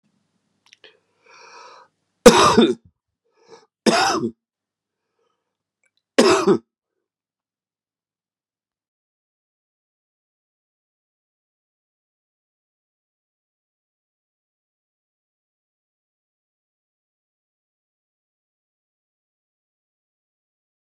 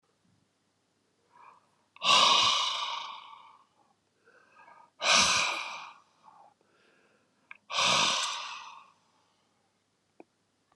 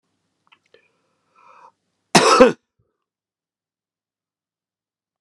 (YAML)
three_cough_length: 20.8 s
three_cough_amplitude: 32768
three_cough_signal_mean_std_ratio: 0.18
exhalation_length: 10.8 s
exhalation_amplitude: 12511
exhalation_signal_mean_std_ratio: 0.39
cough_length: 5.2 s
cough_amplitude: 32768
cough_signal_mean_std_ratio: 0.21
survey_phase: beta (2021-08-13 to 2022-03-07)
age: 45-64
gender: Male
wearing_mask: 'No'
symptom_cough_any: true
symptom_runny_or_blocked_nose: true
symptom_diarrhoea: true
symptom_fatigue: true
symptom_onset: 5 days
smoker_status: Never smoked
respiratory_condition_asthma: false
respiratory_condition_other: false
recruitment_source: Test and Trace
submission_delay: 2 days
covid_test_result: Positive
covid_test_method: RT-qPCR